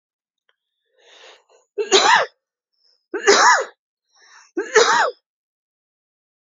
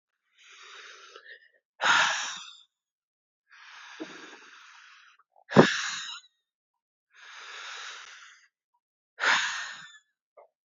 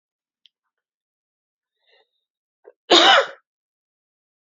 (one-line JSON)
{"three_cough_length": "6.5 s", "three_cough_amplitude": 30313, "three_cough_signal_mean_std_ratio": 0.36, "exhalation_length": "10.7 s", "exhalation_amplitude": 27438, "exhalation_signal_mean_std_ratio": 0.3, "cough_length": "4.5 s", "cough_amplitude": 32768, "cough_signal_mean_std_ratio": 0.22, "survey_phase": "beta (2021-08-13 to 2022-03-07)", "age": "45-64", "gender": "Female", "wearing_mask": "No", "symptom_cough_any": true, "symptom_runny_or_blocked_nose": true, "symptom_sore_throat": true, "symptom_fatigue": true, "symptom_fever_high_temperature": true, "symptom_headache": true, "smoker_status": "Ex-smoker", "respiratory_condition_asthma": true, "respiratory_condition_other": false, "recruitment_source": "Test and Trace", "submission_delay": "1 day", "covid_test_result": "Positive", "covid_test_method": "LFT"}